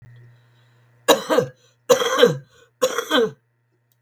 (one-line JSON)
{"three_cough_length": "4.0 s", "three_cough_amplitude": 32768, "three_cough_signal_mean_std_ratio": 0.41, "survey_phase": "beta (2021-08-13 to 2022-03-07)", "age": "65+", "gender": "Female", "wearing_mask": "No", "symptom_cough_any": true, "symptom_runny_or_blocked_nose": true, "symptom_sore_throat": true, "symptom_headache": true, "symptom_onset": "11 days", "smoker_status": "Current smoker (e-cigarettes or vapes only)", "respiratory_condition_asthma": false, "respiratory_condition_other": true, "recruitment_source": "REACT", "submission_delay": "7 days", "covid_test_result": "Negative", "covid_test_method": "RT-qPCR", "influenza_a_test_result": "Negative", "influenza_b_test_result": "Negative"}